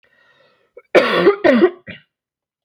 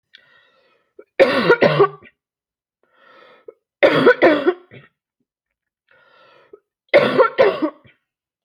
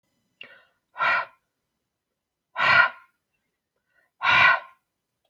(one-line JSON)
{"cough_length": "2.6 s", "cough_amplitude": 29889, "cough_signal_mean_std_ratio": 0.42, "three_cough_length": "8.4 s", "three_cough_amplitude": 32292, "three_cough_signal_mean_std_ratio": 0.37, "exhalation_length": "5.3 s", "exhalation_amplitude": 21513, "exhalation_signal_mean_std_ratio": 0.34, "survey_phase": "beta (2021-08-13 to 2022-03-07)", "age": "45-64", "gender": "Female", "wearing_mask": "No", "symptom_none": true, "smoker_status": "Ex-smoker", "respiratory_condition_asthma": false, "respiratory_condition_other": false, "recruitment_source": "REACT", "submission_delay": "3 days", "covid_test_result": "Negative", "covid_test_method": "RT-qPCR"}